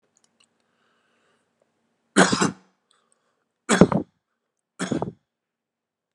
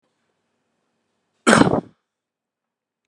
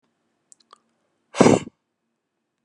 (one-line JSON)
{"three_cough_length": "6.1 s", "three_cough_amplitude": 32768, "three_cough_signal_mean_std_ratio": 0.24, "cough_length": "3.1 s", "cough_amplitude": 32768, "cough_signal_mean_std_ratio": 0.23, "exhalation_length": "2.6 s", "exhalation_amplitude": 32309, "exhalation_signal_mean_std_ratio": 0.2, "survey_phase": "beta (2021-08-13 to 2022-03-07)", "age": "45-64", "gender": "Male", "wearing_mask": "No", "symptom_runny_or_blocked_nose": true, "symptom_change_to_sense_of_smell_or_taste": true, "smoker_status": "Ex-smoker", "respiratory_condition_asthma": false, "respiratory_condition_other": false, "recruitment_source": "Test and Trace", "submission_delay": "2 days", "covid_test_result": "Positive", "covid_test_method": "RT-qPCR", "covid_ct_value": 16.7, "covid_ct_gene": "ORF1ab gene", "covid_ct_mean": 17.6, "covid_viral_load": "1700000 copies/ml", "covid_viral_load_category": "High viral load (>1M copies/ml)"}